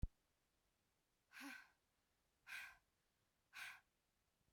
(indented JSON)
{
  "exhalation_length": "4.5 s",
  "exhalation_amplitude": 1008,
  "exhalation_signal_mean_std_ratio": 0.29,
  "survey_phase": "beta (2021-08-13 to 2022-03-07)",
  "age": "18-44",
  "gender": "Female",
  "wearing_mask": "No",
  "symptom_none": true,
  "symptom_onset": "2 days",
  "smoker_status": "Current smoker (e-cigarettes or vapes only)",
  "respiratory_condition_asthma": false,
  "respiratory_condition_other": false,
  "recruitment_source": "REACT",
  "submission_delay": "2 days",
  "covid_test_result": "Negative",
  "covid_test_method": "RT-qPCR",
  "influenza_a_test_result": "Negative",
  "influenza_b_test_result": "Negative"
}